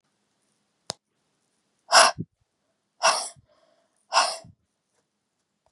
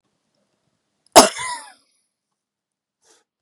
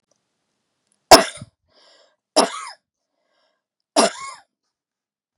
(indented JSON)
{
  "exhalation_length": "5.7 s",
  "exhalation_amplitude": 27939,
  "exhalation_signal_mean_std_ratio": 0.24,
  "cough_length": "3.4 s",
  "cough_amplitude": 32768,
  "cough_signal_mean_std_ratio": 0.17,
  "three_cough_length": "5.4 s",
  "three_cough_amplitude": 32768,
  "three_cough_signal_mean_std_ratio": 0.2,
  "survey_phase": "beta (2021-08-13 to 2022-03-07)",
  "age": "45-64",
  "gender": "Female",
  "wearing_mask": "No",
  "symptom_none": true,
  "smoker_status": "Never smoked",
  "respiratory_condition_asthma": false,
  "respiratory_condition_other": false,
  "recruitment_source": "REACT",
  "submission_delay": "2 days",
  "covid_test_result": "Negative",
  "covid_test_method": "RT-qPCR",
  "influenza_a_test_result": "Negative",
  "influenza_b_test_result": "Negative"
}